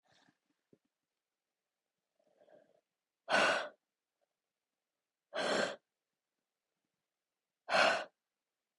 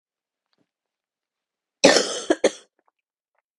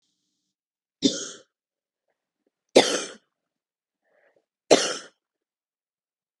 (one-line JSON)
{"exhalation_length": "8.8 s", "exhalation_amplitude": 5123, "exhalation_signal_mean_std_ratio": 0.27, "cough_length": "3.6 s", "cough_amplitude": 30709, "cough_signal_mean_std_ratio": 0.24, "three_cough_length": "6.4 s", "three_cough_amplitude": 28702, "three_cough_signal_mean_std_ratio": 0.21, "survey_phase": "beta (2021-08-13 to 2022-03-07)", "age": "18-44", "gender": "Female", "wearing_mask": "No", "symptom_cough_any": true, "symptom_new_continuous_cough": true, "symptom_runny_or_blocked_nose": true, "symptom_sore_throat": true, "symptom_abdominal_pain": true, "symptom_fatigue": true, "symptom_headache": true, "symptom_other": true, "smoker_status": "Never smoked", "respiratory_condition_asthma": false, "respiratory_condition_other": false, "recruitment_source": "Test and Trace", "submission_delay": "2 days", "covid_test_result": "Positive", "covid_test_method": "RT-qPCR", "covid_ct_value": 27.5, "covid_ct_gene": "ORF1ab gene", "covid_ct_mean": 28.1, "covid_viral_load": "600 copies/ml", "covid_viral_load_category": "Minimal viral load (< 10K copies/ml)"}